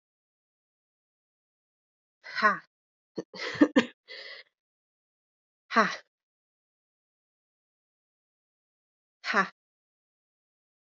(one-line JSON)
{"exhalation_length": "10.8 s", "exhalation_amplitude": 15207, "exhalation_signal_mean_std_ratio": 0.2, "survey_phase": "alpha (2021-03-01 to 2021-08-12)", "age": "18-44", "gender": "Female", "wearing_mask": "No", "symptom_new_continuous_cough": true, "symptom_shortness_of_breath": true, "symptom_fatigue": true, "symptom_change_to_sense_of_smell_or_taste": true, "symptom_loss_of_taste": true, "symptom_onset": "3 days", "smoker_status": "Never smoked", "respiratory_condition_asthma": false, "respiratory_condition_other": false, "recruitment_source": "Test and Trace", "submission_delay": "1 day", "covid_test_result": "Positive", "covid_test_method": "RT-qPCR", "covid_ct_value": 11.7, "covid_ct_gene": "ORF1ab gene", "covid_ct_mean": 12.0, "covid_viral_load": "120000000 copies/ml", "covid_viral_load_category": "High viral load (>1M copies/ml)"}